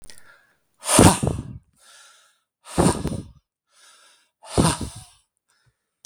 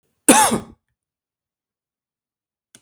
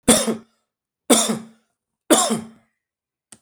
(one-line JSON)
{"exhalation_length": "6.1 s", "exhalation_amplitude": 32768, "exhalation_signal_mean_std_ratio": 0.32, "cough_length": "2.8 s", "cough_amplitude": 32768, "cough_signal_mean_std_ratio": 0.25, "three_cough_length": "3.4 s", "three_cough_amplitude": 32766, "three_cough_signal_mean_std_ratio": 0.37, "survey_phase": "beta (2021-08-13 to 2022-03-07)", "age": "45-64", "gender": "Male", "wearing_mask": "No", "symptom_none": true, "smoker_status": "Ex-smoker", "respiratory_condition_asthma": false, "respiratory_condition_other": false, "recruitment_source": "REACT", "submission_delay": "2 days", "covid_test_result": "Negative", "covid_test_method": "RT-qPCR", "influenza_a_test_result": "Negative", "influenza_b_test_result": "Negative"}